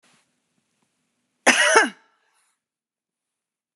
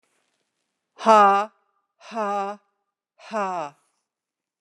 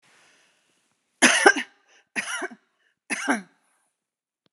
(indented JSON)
{
  "cough_length": "3.8 s",
  "cough_amplitude": 30805,
  "cough_signal_mean_std_ratio": 0.26,
  "exhalation_length": "4.6 s",
  "exhalation_amplitude": 25541,
  "exhalation_signal_mean_std_ratio": 0.32,
  "three_cough_length": "4.5 s",
  "three_cough_amplitude": 31699,
  "three_cough_signal_mean_std_ratio": 0.29,
  "survey_phase": "beta (2021-08-13 to 2022-03-07)",
  "age": "65+",
  "gender": "Female",
  "wearing_mask": "No",
  "symptom_none": true,
  "smoker_status": "Ex-smoker",
  "respiratory_condition_asthma": false,
  "respiratory_condition_other": false,
  "recruitment_source": "REACT",
  "submission_delay": "2 days",
  "covid_test_result": "Negative",
  "covid_test_method": "RT-qPCR",
  "influenza_a_test_result": "Negative",
  "influenza_b_test_result": "Negative"
}